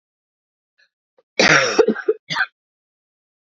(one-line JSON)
{"cough_length": "3.4 s", "cough_amplitude": 29356, "cough_signal_mean_std_ratio": 0.35, "survey_phase": "beta (2021-08-13 to 2022-03-07)", "age": "18-44", "gender": "Female", "wearing_mask": "No", "symptom_cough_any": true, "symptom_new_continuous_cough": true, "symptom_runny_or_blocked_nose": true, "symptom_shortness_of_breath": true, "symptom_sore_throat": true, "symptom_fatigue": true, "symptom_headache": true, "symptom_onset": "4 days", "smoker_status": "Never smoked", "respiratory_condition_asthma": true, "respiratory_condition_other": false, "recruitment_source": "Test and Trace", "submission_delay": "1 day", "covid_test_result": "Positive", "covid_test_method": "ePCR"}